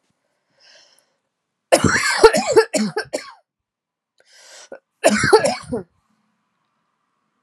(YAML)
cough_length: 7.4 s
cough_amplitude: 32768
cough_signal_mean_std_ratio: 0.35
survey_phase: alpha (2021-03-01 to 2021-08-12)
age: 45-64
gender: Female
wearing_mask: 'No'
symptom_cough_any: true
symptom_fatigue: true
symptom_change_to_sense_of_smell_or_taste: true
symptom_loss_of_taste: true
symptom_onset: 4 days
smoker_status: Never smoked
respiratory_condition_asthma: false
respiratory_condition_other: false
recruitment_source: Test and Trace
submission_delay: 2 days
covid_test_result: Positive
covid_test_method: RT-qPCR
covid_ct_value: 21.5
covid_ct_gene: ORF1ab gene
covid_ct_mean: 22.3
covid_viral_load: 48000 copies/ml
covid_viral_load_category: Low viral load (10K-1M copies/ml)